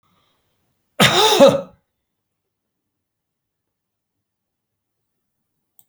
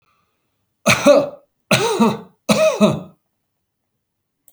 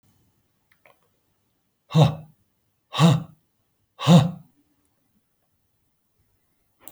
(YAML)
cough_length: 5.9 s
cough_amplitude: 30185
cough_signal_mean_std_ratio: 0.24
three_cough_length: 4.5 s
three_cough_amplitude: 32592
three_cough_signal_mean_std_ratio: 0.43
exhalation_length: 6.9 s
exhalation_amplitude: 24990
exhalation_signal_mean_std_ratio: 0.26
survey_phase: alpha (2021-03-01 to 2021-08-12)
age: 45-64
gender: Male
wearing_mask: 'No'
symptom_none: true
smoker_status: Ex-smoker
respiratory_condition_asthma: false
respiratory_condition_other: false
recruitment_source: REACT
submission_delay: 2 days
covid_test_result: Negative
covid_test_method: RT-qPCR